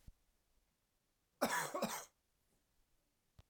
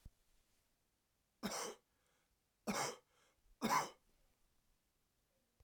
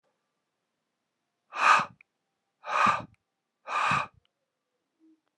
{"cough_length": "3.5 s", "cough_amplitude": 2745, "cough_signal_mean_std_ratio": 0.32, "three_cough_length": "5.6 s", "three_cough_amplitude": 1839, "three_cough_signal_mean_std_ratio": 0.31, "exhalation_length": "5.4 s", "exhalation_amplitude": 12103, "exhalation_signal_mean_std_ratio": 0.32, "survey_phase": "alpha (2021-03-01 to 2021-08-12)", "age": "45-64", "gender": "Male", "wearing_mask": "No", "symptom_cough_any": true, "symptom_fever_high_temperature": true, "symptom_headache": true, "smoker_status": "Never smoked", "respiratory_condition_asthma": false, "respiratory_condition_other": false, "recruitment_source": "Test and Trace", "submission_delay": "1 day", "covid_test_result": "Positive", "covid_test_method": "RT-qPCR"}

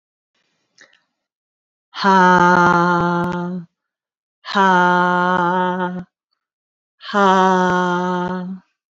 {"exhalation_length": "9.0 s", "exhalation_amplitude": 28202, "exhalation_signal_mean_std_ratio": 0.58, "survey_phase": "beta (2021-08-13 to 2022-03-07)", "age": "45-64", "gender": "Female", "wearing_mask": "No", "symptom_none": true, "smoker_status": "Never smoked", "respiratory_condition_asthma": false, "respiratory_condition_other": false, "recruitment_source": "REACT", "submission_delay": "1 day", "covid_test_result": "Negative", "covid_test_method": "RT-qPCR"}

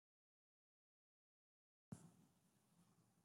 {"cough_length": "3.2 s", "cough_amplitude": 250, "cough_signal_mean_std_ratio": 0.25, "survey_phase": "beta (2021-08-13 to 2022-03-07)", "age": "65+", "gender": "Female", "wearing_mask": "No", "symptom_cough_any": true, "symptom_fatigue": true, "smoker_status": "Ex-smoker", "respiratory_condition_asthma": false, "respiratory_condition_other": false, "recruitment_source": "REACT", "submission_delay": "2 days", "covid_test_result": "Negative", "covid_test_method": "RT-qPCR"}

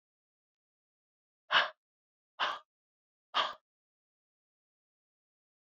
{"exhalation_length": "5.7 s", "exhalation_amplitude": 8099, "exhalation_signal_mean_std_ratio": 0.21, "survey_phase": "beta (2021-08-13 to 2022-03-07)", "age": "65+", "gender": "Female", "wearing_mask": "No", "symptom_cough_any": true, "symptom_runny_or_blocked_nose": true, "symptom_fatigue": true, "symptom_fever_high_temperature": true, "symptom_headache": true, "symptom_change_to_sense_of_smell_or_taste": true, "symptom_onset": "6 days", "smoker_status": "Never smoked", "respiratory_condition_asthma": false, "respiratory_condition_other": false, "recruitment_source": "Test and Trace", "submission_delay": "2 days", "covid_test_result": "Positive", "covid_test_method": "RT-qPCR"}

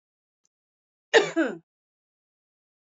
{"cough_length": "2.8 s", "cough_amplitude": 18753, "cough_signal_mean_std_ratio": 0.24, "survey_phase": "beta (2021-08-13 to 2022-03-07)", "age": "45-64", "gender": "Female", "wearing_mask": "No", "symptom_cough_any": true, "symptom_runny_or_blocked_nose": true, "smoker_status": "Never smoked", "respiratory_condition_asthma": false, "respiratory_condition_other": false, "recruitment_source": "Test and Trace", "submission_delay": "1 day", "covid_test_result": "Positive", "covid_test_method": "LFT"}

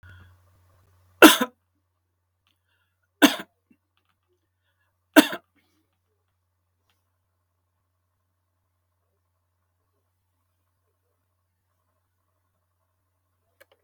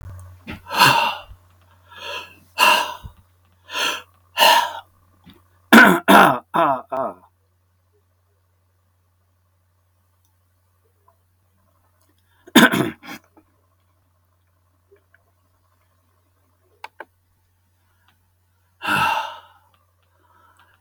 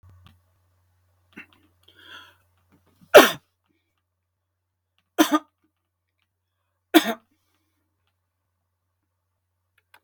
{"cough_length": "13.8 s", "cough_amplitude": 32768, "cough_signal_mean_std_ratio": 0.12, "exhalation_length": "20.8 s", "exhalation_amplitude": 32767, "exhalation_signal_mean_std_ratio": 0.29, "three_cough_length": "10.0 s", "three_cough_amplitude": 32767, "three_cough_signal_mean_std_ratio": 0.15, "survey_phase": "beta (2021-08-13 to 2022-03-07)", "age": "65+", "gender": "Male", "wearing_mask": "No", "symptom_none": true, "smoker_status": "Ex-smoker", "respiratory_condition_asthma": false, "respiratory_condition_other": false, "recruitment_source": "REACT", "submission_delay": "1 day", "covid_test_result": "Negative", "covid_test_method": "RT-qPCR", "influenza_a_test_result": "Negative", "influenza_b_test_result": "Negative"}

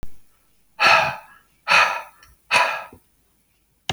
{"exhalation_length": "3.9 s", "exhalation_amplitude": 27513, "exhalation_signal_mean_std_ratio": 0.42, "survey_phase": "beta (2021-08-13 to 2022-03-07)", "age": "45-64", "gender": "Male", "wearing_mask": "No", "symptom_none": true, "smoker_status": "Never smoked", "respiratory_condition_asthma": false, "respiratory_condition_other": false, "recruitment_source": "REACT", "submission_delay": "0 days", "covid_test_result": "Negative", "covid_test_method": "RT-qPCR"}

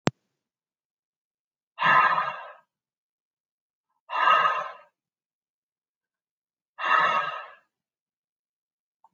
{"exhalation_length": "9.1 s", "exhalation_amplitude": 28866, "exhalation_signal_mean_std_ratio": 0.33, "survey_phase": "alpha (2021-03-01 to 2021-08-12)", "age": "65+", "gender": "Male", "wearing_mask": "No", "symptom_none": true, "smoker_status": "Ex-smoker", "respiratory_condition_asthma": false, "respiratory_condition_other": false, "recruitment_source": "REACT", "submission_delay": "1 day", "covid_test_result": "Negative", "covid_test_method": "RT-qPCR"}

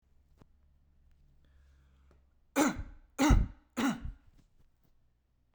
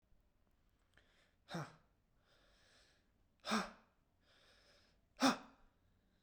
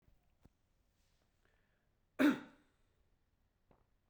{"three_cough_length": "5.5 s", "three_cough_amplitude": 8677, "three_cough_signal_mean_std_ratio": 0.3, "exhalation_length": "6.2 s", "exhalation_amplitude": 4012, "exhalation_signal_mean_std_ratio": 0.23, "cough_length": "4.1 s", "cough_amplitude": 4179, "cough_signal_mean_std_ratio": 0.18, "survey_phase": "beta (2021-08-13 to 2022-03-07)", "age": "18-44", "gender": "Male", "wearing_mask": "No", "symptom_none": true, "smoker_status": "Never smoked", "respiratory_condition_asthma": false, "respiratory_condition_other": false, "recruitment_source": "REACT", "submission_delay": "0 days", "covid_test_result": "Negative", "covid_test_method": "RT-qPCR", "influenza_a_test_result": "Negative", "influenza_b_test_result": "Negative"}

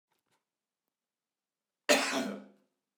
{"cough_length": "3.0 s", "cough_amplitude": 11052, "cough_signal_mean_std_ratio": 0.28, "survey_phase": "beta (2021-08-13 to 2022-03-07)", "age": "45-64", "gender": "Male", "wearing_mask": "No", "symptom_fatigue": true, "smoker_status": "Never smoked", "respiratory_condition_asthma": false, "respiratory_condition_other": false, "recruitment_source": "REACT", "submission_delay": "1 day", "covid_test_result": "Negative", "covid_test_method": "RT-qPCR"}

